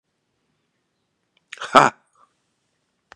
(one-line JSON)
{"exhalation_length": "3.2 s", "exhalation_amplitude": 32768, "exhalation_signal_mean_std_ratio": 0.16, "survey_phase": "beta (2021-08-13 to 2022-03-07)", "age": "65+", "gender": "Male", "wearing_mask": "No", "symptom_cough_any": true, "symptom_runny_or_blocked_nose": true, "symptom_sore_throat": true, "symptom_other": true, "symptom_onset": "3 days", "smoker_status": "Never smoked", "respiratory_condition_asthma": false, "respiratory_condition_other": false, "recruitment_source": "Test and Trace", "submission_delay": "2 days", "covid_test_result": "Positive", "covid_test_method": "RT-qPCR", "covid_ct_value": 19.8, "covid_ct_gene": "ORF1ab gene", "covid_ct_mean": 20.2, "covid_viral_load": "240000 copies/ml", "covid_viral_load_category": "Low viral load (10K-1M copies/ml)"}